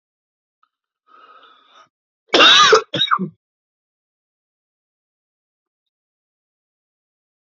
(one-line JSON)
{"cough_length": "7.5 s", "cough_amplitude": 31865, "cough_signal_mean_std_ratio": 0.25, "survey_phase": "beta (2021-08-13 to 2022-03-07)", "age": "45-64", "gender": "Male", "wearing_mask": "No", "symptom_cough_any": true, "symptom_runny_or_blocked_nose": true, "symptom_sore_throat": true, "symptom_fatigue": true, "symptom_fever_high_temperature": true, "symptom_headache": true, "symptom_onset": "6 days", "smoker_status": "Ex-smoker", "respiratory_condition_asthma": false, "respiratory_condition_other": false, "recruitment_source": "Test and Trace", "submission_delay": "2 days", "covid_test_result": "Positive", "covid_test_method": "ePCR"}